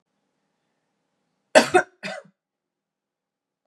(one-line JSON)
{"cough_length": "3.7 s", "cough_amplitude": 31916, "cough_signal_mean_std_ratio": 0.18, "survey_phase": "beta (2021-08-13 to 2022-03-07)", "age": "45-64", "gender": "Female", "wearing_mask": "No", "symptom_cough_any": true, "symptom_new_continuous_cough": true, "symptom_runny_or_blocked_nose": true, "symptom_sore_throat": true, "symptom_other": true, "smoker_status": "Never smoked", "respiratory_condition_asthma": false, "respiratory_condition_other": false, "recruitment_source": "Test and Trace", "submission_delay": "0 days", "covid_test_result": "Positive", "covid_test_method": "RT-qPCR"}